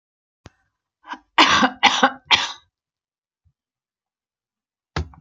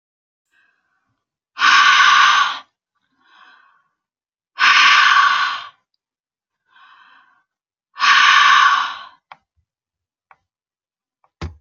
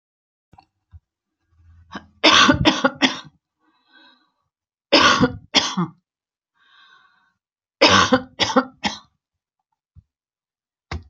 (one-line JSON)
{"cough_length": "5.2 s", "cough_amplitude": 31154, "cough_signal_mean_std_ratio": 0.3, "exhalation_length": "11.6 s", "exhalation_amplitude": 32767, "exhalation_signal_mean_std_ratio": 0.42, "three_cough_length": "11.1 s", "three_cough_amplitude": 32096, "three_cough_signal_mean_std_ratio": 0.33, "survey_phase": "alpha (2021-03-01 to 2021-08-12)", "age": "65+", "gender": "Female", "wearing_mask": "No", "symptom_none": true, "smoker_status": "Never smoked", "respiratory_condition_asthma": false, "respiratory_condition_other": false, "recruitment_source": "REACT", "submission_delay": "1 day", "covid_test_result": "Negative", "covid_test_method": "RT-qPCR"}